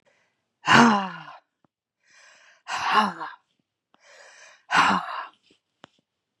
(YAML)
exhalation_length: 6.4 s
exhalation_amplitude: 32303
exhalation_signal_mean_std_ratio: 0.34
survey_phase: beta (2021-08-13 to 2022-03-07)
age: 65+
gender: Female
wearing_mask: 'No'
symptom_none: true
smoker_status: Ex-smoker
respiratory_condition_asthma: false
respiratory_condition_other: false
recruitment_source: REACT
submission_delay: 1 day
covid_test_result: Negative
covid_test_method: RT-qPCR
influenza_a_test_result: Negative
influenza_b_test_result: Negative